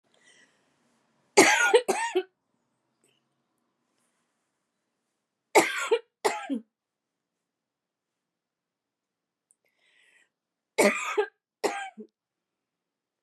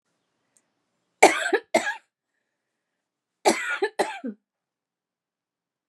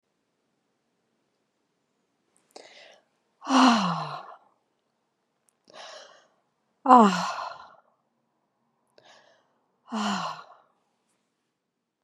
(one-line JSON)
{"three_cough_length": "13.2 s", "three_cough_amplitude": 22955, "three_cough_signal_mean_std_ratio": 0.27, "cough_length": "5.9 s", "cough_amplitude": 32767, "cough_signal_mean_std_ratio": 0.27, "exhalation_length": "12.0 s", "exhalation_amplitude": 28629, "exhalation_signal_mean_std_ratio": 0.25, "survey_phase": "beta (2021-08-13 to 2022-03-07)", "age": "45-64", "gender": "Female", "wearing_mask": "Yes", "symptom_cough_any": true, "symptom_fever_high_temperature": true, "symptom_headache": true, "smoker_status": "Never smoked", "respiratory_condition_asthma": false, "respiratory_condition_other": false, "recruitment_source": "Test and Trace", "submission_delay": "2 days", "covid_test_result": "Positive", "covid_test_method": "RT-qPCR", "covid_ct_value": 17.3, "covid_ct_gene": "ORF1ab gene", "covid_ct_mean": 17.7, "covid_viral_load": "1600000 copies/ml", "covid_viral_load_category": "High viral load (>1M copies/ml)"}